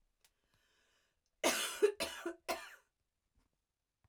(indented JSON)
{
  "cough_length": "4.1 s",
  "cough_amplitude": 3993,
  "cough_signal_mean_std_ratio": 0.31,
  "survey_phase": "beta (2021-08-13 to 2022-03-07)",
  "age": "45-64",
  "gender": "Female",
  "wearing_mask": "No",
  "symptom_none": true,
  "symptom_onset": "5 days",
  "smoker_status": "Never smoked",
  "respiratory_condition_asthma": false,
  "respiratory_condition_other": false,
  "recruitment_source": "REACT",
  "submission_delay": "1 day",
  "covid_test_result": "Negative",
  "covid_test_method": "RT-qPCR",
  "influenza_a_test_result": "Negative",
  "influenza_b_test_result": "Negative"
}